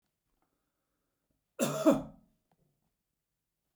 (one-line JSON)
{"cough_length": "3.8 s", "cough_amplitude": 7545, "cough_signal_mean_std_ratio": 0.23, "survey_phase": "beta (2021-08-13 to 2022-03-07)", "age": "65+", "gender": "Male", "wearing_mask": "No", "symptom_none": true, "smoker_status": "Never smoked", "respiratory_condition_asthma": false, "respiratory_condition_other": false, "recruitment_source": "REACT", "submission_delay": "1 day", "covid_test_result": "Negative", "covid_test_method": "RT-qPCR"}